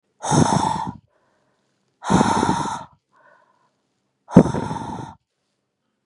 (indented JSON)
{
  "exhalation_length": "6.1 s",
  "exhalation_amplitude": 32768,
  "exhalation_signal_mean_std_ratio": 0.38,
  "survey_phase": "beta (2021-08-13 to 2022-03-07)",
  "age": "45-64",
  "gender": "Female",
  "wearing_mask": "No",
  "symptom_none": true,
  "smoker_status": "Ex-smoker",
  "respiratory_condition_asthma": false,
  "respiratory_condition_other": false,
  "recruitment_source": "REACT",
  "submission_delay": "2 days",
  "covid_test_result": "Negative",
  "covid_test_method": "RT-qPCR",
  "influenza_a_test_result": "Negative",
  "influenza_b_test_result": "Negative"
}